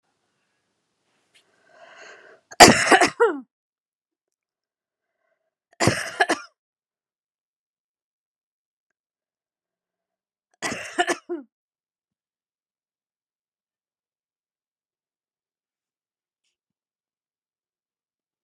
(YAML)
three_cough_length: 18.4 s
three_cough_amplitude: 32768
three_cough_signal_mean_std_ratio: 0.17
survey_phase: beta (2021-08-13 to 2022-03-07)
age: 18-44
gender: Female
wearing_mask: 'No'
symptom_runny_or_blocked_nose: true
symptom_fatigue: true
symptom_headache: true
symptom_change_to_sense_of_smell_or_taste: true
symptom_onset: 5 days
smoker_status: Never smoked
respiratory_condition_asthma: false
respiratory_condition_other: false
recruitment_source: Test and Trace
submission_delay: 2 days
covid_test_result: Positive
covid_test_method: RT-qPCR